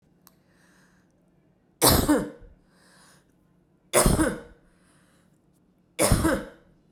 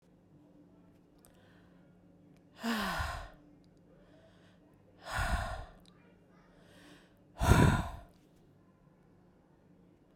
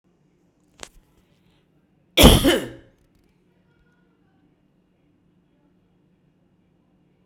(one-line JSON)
{"three_cough_length": "6.9 s", "three_cough_amplitude": 25068, "three_cough_signal_mean_std_ratio": 0.35, "exhalation_length": "10.2 s", "exhalation_amplitude": 8591, "exhalation_signal_mean_std_ratio": 0.31, "cough_length": "7.3 s", "cough_amplitude": 32768, "cough_signal_mean_std_ratio": 0.19, "survey_phase": "beta (2021-08-13 to 2022-03-07)", "age": "18-44", "gender": "Female", "wearing_mask": "No", "symptom_none": true, "smoker_status": "Ex-smoker", "respiratory_condition_asthma": false, "respiratory_condition_other": false, "recruitment_source": "REACT", "submission_delay": "1 day", "covid_test_result": "Negative", "covid_test_method": "RT-qPCR"}